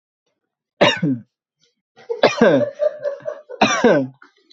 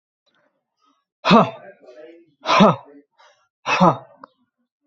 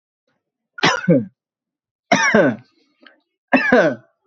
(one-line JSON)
{"three_cough_length": "4.5 s", "three_cough_amplitude": 28243, "three_cough_signal_mean_std_ratio": 0.47, "exhalation_length": "4.9 s", "exhalation_amplitude": 27726, "exhalation_signal_mean_std_ratio": 0.32, "cough_length": "4.3 s", "cough_amplitude": 32767, "cough_signal_mean_std_ratio": 0.42, "survey_phase": "alpha (2021-03-01 to 2021-08-12)", "age": "18-44", "gender": "Male", "wearing_mask": "Yes", "symptom_cough_any": true, "symptom_fever_high_temperature": true, "symptom_onset": "5 days", "smoker_status": "Current smoker (1 to 10 cigarettes per day)", "respiratory_condition_asthma": false, "respiratory_condition_other": false, "recruitment_source": "Test and Trace", "submission_delay": "2 days", "covid_test_result": "Positive", "covid_test_method": "RT-qPCR", "covid_ct_value": 17.6, "covid_ct_gene": "ORF1ab gene", "covid_ct_mean": 17.6, "covid_viral_load": "1700000 copies/ml", "covid_viral_load_category": "High viral load (>1M copies/ml)"}